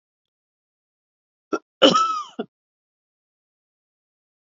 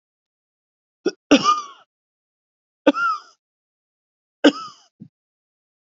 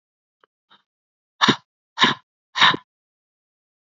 {"cough_length": "4.5 s", "cough_amplitude": 32768, "cough_signal_mean_std_ratio": 0.23, "three_cough_length": "5.8 s", "three_cough_amplitude": 27552, "three_cough_signal_mean_std_ratio": 0.26, "exhalation_length": "3.9 s", "exhalation_amplitude": 32768, "exhalation_signal_mean_std_ratio": 0.25, "survey_phase": "beta (2021-08-13 to 2022-03-07)", "age": "18-44", "gender": "Male", "wearing_mask": "No", "symptom_cough_any": true, "symptom_runny_or_blocked_nose": true, "symptom_fatigue": true, "symptom_change_to_sense_of_smell_or_taste": true, "symptom_loss_of_taste": true, "symptom_onset": "5 days", "smoker_status": "Never smoked", "respiratory_condition_asthma": false, "respiratory_condition_other": false, "recruitment_source": "Test and Trace", "submission_delay": "2 days", "covid_test_result": "Positive", "covid_test_method": "RT-qPCR", "covid_ct_value": 20.8, "covid_ct_gene": "ORF1ab gene"}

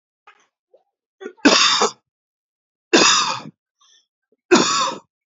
{"three_cough_length": "5.4 s", "three_cough_amplitude": 32767, "three_cough_signal_mean_std_ratio": 0.39, "survey_phase": "beta (2021-08-13 to 2022-03-07)", "age": "18-44", "gender": "Male", "wearing_mask": "No", "symptom_none": true, "smoker_status": "Current smoker (1 to 10 cigarettes per day)", "respiratory_condition_asthma": false, "respiratory_condition_other": false, "recruitment_source": "REACT", "submission_delay": "2 days", "covid_test_result": "Negative", "covid_test_method": "RT-qPCR", "influenza_a_test_result": "Negative", "influenza_b_test_result": "Negative"}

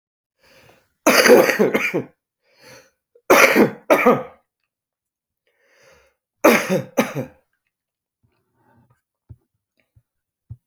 {"three_cough_length": "10.7 s", "three_cough_amplitude": 32768, "three_cough_signal_mean_std_ratio": 0.33, "survey_phase": "beta (2021-08-13 to 2022-03-07)", "age": "65+", "gender": "Male", "wearing_mask": "No", "symptom_cough_any": true, "symptom_new_continuous_cough": true, "symptom_runny_or_blocked_nose": true, "symptom_shortness_of_breath": true, "symptom_fatigue": true, "symptom_headache": true, "symptom_change_to_sense_of_smell_or_taste": true, "symptom_loss_of_taste": true, "symptom_onset": "6 days", "smoker_status": "Never smoked", "respiratory_condition_asthma": false, "respiratory_condition_other": false, "recruitment_source": "Test and Trace", "submission_delay": "2 days", "covid_test_result": "Positive", "covid_test_method": "RT-qPCR", "covid_ct_value": 15.4, "covid_ct_gene": "ORF1ab gene", "covid_ct_mean": 15.6, "covid_viral_load": "7600000 copies/ml", "covid_viral_load_category": "High viral load (>1M copies/ml)"}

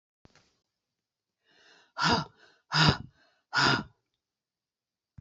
{"exhalation_length": "5.2 s", "exhalation_amplitude": 14135, "exhalation_signal_mean_std_ratio": 0.31, "survey_phase": "beta (2021-08-13 to 2022-03-07)", "age": "65+", "gender": "Female", "wearing_mask": "No", "symptom_runny_or_blocked_nose": true, "symptom_onset": "12 days", "smoker_status": "Ex-smoker", "respiratory_condition_asthma": false, "respiratory_condition_other": false, "recruitment_source": "REACT", "submission_delay": "2 days", "covid_test_result": "Negative", "covid_test_method": "RT-qPCR", "influenza_a_test_result": "Negative", "influenza_b_test_result": "Negative"}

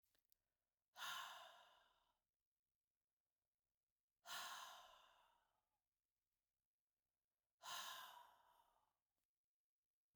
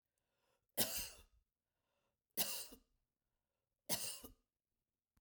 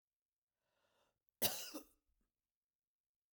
{"exhalation_length": "10.2 s", "exhalation_amplitude": 346, "exhalation_signal_mean_std_ratio": 0.35, "three_cough_length": "5.2 s", "three_cough_amplitude": 3034, "three_cough_signal_mean_std_ratio": 0.31, "cough_length": "3.3 s", "cough_amplitude": 3076, "cough_signal_mean_std_ratio": 0.21, "survey_phase": "beta (2021-08-13 to 2022-03-07)", "age": "45-64", "gender": "Female", "wearing_mask": "No", "symptom_headache": true, "symptom_onset": "7 days", "smoker_status": "Never smoked", "respiratory_condition_asthma": false, "respiratory_condition_other": false, "recruitment_source": "REACT", "submission_delay": "0 days", "covid_test_result": "Negative", "covid_test_method": "RT-qPCR"}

